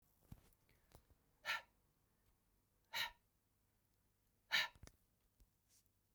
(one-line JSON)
{"exhalation_length": "6.1 s", "exhalation_amplitude": 2006, "exhalation_signal_mean_std_ratio": 0.24, "survey_phase": "beta (2021-08-13 to 2022-03-07)", "age": "18-44", "gender": "Male", "wearing_mask": "No", "symptom_none": true, "smoker_status": "Never smoked", "respiratory_condition_asthma": false, "respiratory_condition_other": false, "recruitment_source": "REACT", "submission_delay": "0 days", "covid_test_result": "Negative", "covid_test_method": "RT-qPCR"}